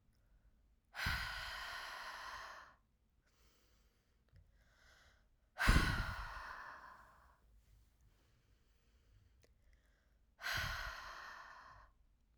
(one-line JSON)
{"exhalation_length": "12.4 s", "exhalation_amplitude": 3982, "exhalation_signal_mean_std_ratio": 0.36, "survey_phase": "alpha (2021-03-01 to 2021-08-12)", "age": "18-44", "gender": "Female", "wearing_mask": "No", "symptom_none": true, "smoker_status": "Never smoked", "respiratory_condition_asthma": false, "respiratory_condition_other": false, "recruitment_source": "REACT", "submission_delay": "1 day", "covid_test_result": "Negative", "covid_test_method": "RT-qPCR"}